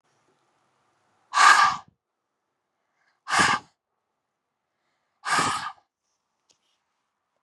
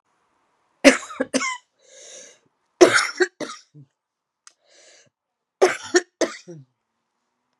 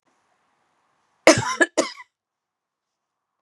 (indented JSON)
{
  "exhalation_length": "7.4 s",
  "exhalation_amplitude": 24717,
  "exhalation_signal_mean_std_ratio": 0.28,
  "three_cough_length": "7.6 s",
  "three_cough_amplitude": 32768,
  "three_cough_signal_mean_std_ratio": 0.26,
  "cough_length": "3.4 s",
  "cough_amplitude": 32767,
  "cough_signal_mean_std_ratio": 0.23,
  "survey_phase": "beta (2021-08-13 to 2022-03-07)",
  "age": "45-64",
  "gender": "Female",
  "wearing_mask": "No",
  "symptom_cough_any": true,
  "symptom_fatigue": true,
  "smoker_status": "Ex-smoker",
  "respiratory_condition_asthma": false,
  "respiratory_condition_other": false,
  "recruitment_source": "REACT",
  "submission_delay": "3 days",
  "covid_test_result": "Negative",
  "covid_test_method": "RT-qPCR",
  "influenza_a_test_result": "Negative",
  "influenza_b_test_result": "Negative"
}